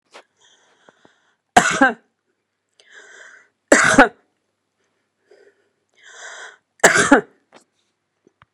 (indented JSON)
{
  "three_cough_length": "8.5 s",
  "three_cough_amplitude": 32768,
  "three_cough_signal_mean_std_ratio": 0.26,
  "survey_phase": "beta (2021-08-13 to 2022-03-07)",
  "age": "65+",
  "gender": "Female",
  "wearing_mask": "No",
  "symptom_none": true,
  "smoker_status": "Never smoked",
  "respiratory_condition_asthma": false,
  "respiratory_condition_other": false,
  "recruitment_source": "REACT",
  "submission_delay": "2 days",
  "covid_test_result": "Negative",
  "covid_test_method": "RT-qPCR",
  "influenza_a_test_result": "Negative",
  "influenza_b_test_result": "Negative"
}